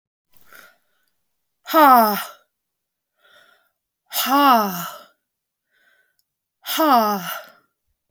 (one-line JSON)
{"exhalation_length": "8.1 s", "exhalation_amplitude": 29297, "exhalation_signal_mean_std_ratio": 0.36, "survey_phase": "beta (2021-08-13 to 2022-03-07)", "age": "45-64", "gender": "Female", "wearing_mask": "No", "symptom_fatigue": true, "symptom_loss_of_taste": true, "smoker_status": "Never smoked", "respiratory_condition_asthma": true, "respiratory_condition_other": false, "recruitment_source": "REACT", "submission_delay": "2 days", "covid_test_result": "Negative", "covid_test_method": "RT-qPCR"}